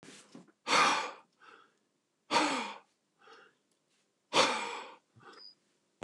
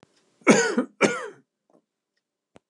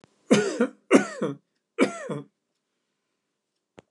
exhalation_length: 6.0 s
exhalation_amplitude: 9105
exhalation_signal_mean_std_ratio: 0.37
cough_length: 2.7 s
cough_amplitude: 24761
cough_signal_mean_std_ratio: 0.33
three_cough_length: 3.9 s
three_cough_amplitude: 24570
three_cough_signal_mean_std_ratio: 0.33
survey_phase: beta (2021-08-13 to 2022-03-07)
age: 65+
gender: Male
wearing_mask: 'No'
symptom_none: true
smoker_status: Never smoked
respiratory_condition_asthma: false
respiratory_condition_other: false
recruitment_source: REACT
submission_delay: 2 days
covid_test_result: Negative
covid_test_method: RT-qPCR
influenza_a_test_result: Negative
influenza_b_test_result: Negative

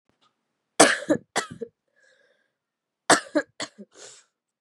three_cough_length: 4.6 s
three_cough_amplitude: 32767
three_cough_signal_mean_std_ratio: 0.25
survey_phase: beta (2021-08-13 to 2022-03-07)
age: 18-44
gender: Female
wearing_mask: 'No'
symptom_cough_any: true
symptom_new_continuous_cough: true
symptom_runny_or_blocked_nose: true
symptom_shortness_of_breath: true
symptom_abdominal_pain: true
symptom_fatigue: true
symptom_headache: true
smoker_status: Never smoked
respiratory_condition_asthma: false
respiratory_condition_other: false
recruitment_source: Test and Trace
submission_delay: 1 day
covid_test_result: Positive
covid_test_method: RT-qPCR
covid_ct_value: 21.7
covid_ct_gene: ORF1ab gene
covid_ct_mean: 23.3
covid_viral_load: 24000 copies/ml
covid_viral_load_category: Low viral load (10K-1M copies/ml)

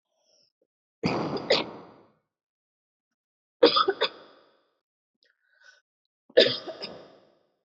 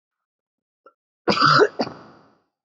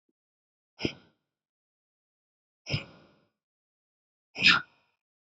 three_cough_length: 7.8 s
three_cough_amplitude: 17898
three_cough_signal_mean_std_ratio: 0.27
cough_length: 2.6 s
cough_amplitude: 20323
cough_signal_mean_std_ratio: 0.34
exhalation_length: 5.4 s
exhalation_amplitude: 14506
exhalation_signal_mean_std_ratio: 0.19
survey_phase: beta (2021-08-13 to 2022-03-07)
age: 18-44
gender: Female
wearing_mask: 'No'
symptom_cough_any: true
symptom_new_continuous_cough: true
symptom_runny_or_blocked_nose: true
symptom_fatigue: true
symptom_headache: true
symptom_change_to_sense_of_smell_or_taste: true
symptom_loss_of_taste: true
symptom_onset: 6 days
smoker_status: Never smoked
respiratory_condition_asthma: false
respiratory_condition_other: false
recruitment_source: Test and Trace
submission_delay: 1 day
covid_test_result: Positive
covid_test_method: RT-qPCR
covid_ct_value: 28.6
covid_ct_gene: ORF1ab gene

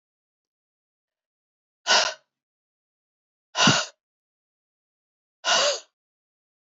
exhalation_length: 6.7 s
exhalation_amplitude: 20419
exhalation_signal_mean_std_ratio: 0.27
survey_phase: beta (2021-08-13 to 2022-03-07)
age: 45-64
gender: Female
wearing_mask: 'No'
symptom_runny_or_blocked_nose: true
symptom_onset: 12 days
smoker_status: Never smoked
respiratory_condition_asthma: false
respiratory_condition_other: false
recruitment_source: REACT
submission_delay: 3 days
covid_test_result: Negative
covid_test_method: RT-qPCR
influenza_a_test_result: Negative
influenza_b_test_result: Negative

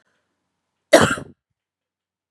cough_length: 2.3 s
cough_amplitude: 32768
cough_signal_mean_std_ratio: 0.22
survey_phase: beta (2021-08-13 to 2022-03-07)
age: 45-64
gender: Female
wearing_mask: 'No'
symptom_none: true
smoker_status: Never smoked
respiratory_condition_asthma: false
respiratory_condition_other: false
recruitment_source: REACT
submission_delay: 4 days
covid_test_result: Negative
covid_test_method: RT-qPCR
influenza_a_test_result: Negative
influenza_b_test_result: Negative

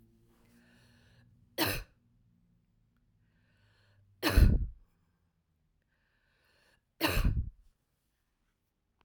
three_cough_length: 9.0 s
three_cough_amplitude: 9915
three_cough_signal_mean_std_ratio: 0.26
survey_phase: alpha (2021-03-01 to 2021-08-12)
age: 45-64
gender: Female
wearing_mask: 'No'
symptom_none: true
smoker_status: Never smoked
respiratory_condition_asthma: false
respiratory_condition_other: false
recruitment_source: REACT
submission_delay: 1 day
covid_test_result: Negative
covid_test_method: RT-qPCR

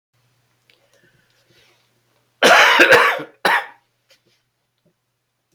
cough_length: 5.5 s
cough_amplitude: 31924
cough_signal_mean_std_ratio: 0.33
survey_phase: beta (2021-08-13 to 2022-03-07)
age: 65+
gender: Male
wearing_mask: 'No'
symptom_cough_any: true
symptom_fatigue: true
symptom_onset: 7 days
smoker_status: Never smoked
respiratory_condition_asthma: false
respiratory_condition_other: false
recruitment_source: Test and Trace
submission_delay: 2 days
covid_test_result: Positive
covid_test_method: RT-qPCR
covid_ct_value: 15.7
covid_ct_gene: ORF1ab gene
covid_ct_mean: 16.3
covid_viral_load: 4600000 copies/ml
covid_viral_load_category: High viral load (>1M copies/ml)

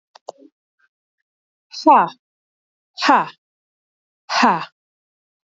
exhalation_length: 5.5 s
exhalation_amplitude: 26762
exhalation_signal_mean_std_ratio: 0.29
survey_phase: beta (2021-08-13 to 2022-03-07)
age: 45-64
gender: Female
wearing_mask: 'No'
symptom_fatigue: true
symptom_onset: 12 days
smoker_status: Ex-smoker
respiratory_condition_asthma: false
respiratory_condition_other: false
recruitment_source: REACT
submission_delay: 1 day
covid_test_result: Negative
covid_test_method: RT-qPCR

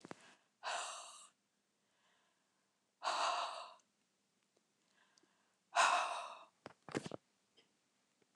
exhalation_length: 8.4 s
exhalation_amplitude: 3149
exhalation_signal_mean_std_ratio: 0.33
survey_phase: beta (2021-08-13 to 2022-03-07)
age: 65+
gender: Female
wearing_mask: 'No'
symptom_none: true
smoker_status: Never smoked
respiratory_condition_asthma: false
respiratory_condition_other: false
recruitment_source: REACT
submission_delay: 8 days
covid_test_result: Negative
covid_test_method: RT-qPCR
influenza_a_test_result: Negative
influenza_b_test_result: Negative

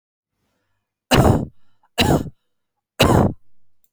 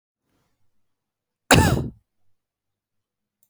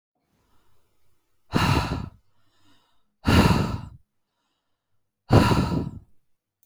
three_cough_length: 3.9 s
three_cough_amplitude: 28102
three_cough_signal_mean_std_ratio: 0.4
cough_length: 3.5 s
cough_amplitude: 30497
cough_signal_mean_std_ratio: 0.24
exhalation_length: 6.7 s
exhalation_amplitude: 26344
exhalation_signal_mean_std_ratio: 0.38
survey_phase: beta (2021-08-13 to 2022-03-07)
age: 18-44
gender: Female
wearing_mask: 'No'
symptom_none: true
smoker_status: Ex-smoker
respiratory_condition_asthma: false
respiratory_condition_other: false
recruitment_source: REACT
submission_delay: 3 days
covid_test_result: Negative
covid_test_method: RT-qPCR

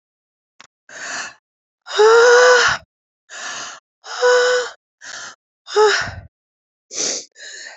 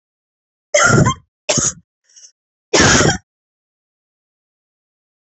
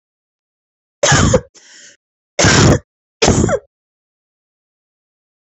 exhalation_length: 7.8 s
exhalation_amplitude: 28383
exhalation_signal_mean_std_ratio: 0.45
cough_length: 5.2 s
cough_amplitude: 32768
cough_signal_mean_std_ratio: 0.37
three_cough_length: 5.5 s
three_cough_amplitude: 32768
three_cough_signal_mean_std_ratio: 0.37
survey_phase: beta (2021-08-13 to 2022-03-07)
age: 45-64
gender: Female
wearing_mask: 'No'
symptom_cough_any: true
symptom_new_continuous_cough: true
symptom_runny_or_blocked_nose: true
symptom_shortness_of_breath: true
symptom_sore_throat: true
symptom_fatigue: true
symptom_fever_high_temperature: true
symptom_headache: true
symptom_change_to_sense_of_smell_or_taste: true
symptom_loss_of_taste: true
symptom_onset: 6 days
smoker_status: Never smoked
respiratory_condition_asthma: false
respiratory_condition_other: false
recruitment_source: Test and Trace
submission_delay: 3 days
covid_test_result: Positive
covid_test_method: RT-qPCR
covid_ct_value: 20.1
covid_ct_gene: ORF1ab gene
covid_ct_mean: 20.4
covid_viral_load: 210000 copies/ml
covid_viral_load_category: Low viral load (10K-1M copies/ml)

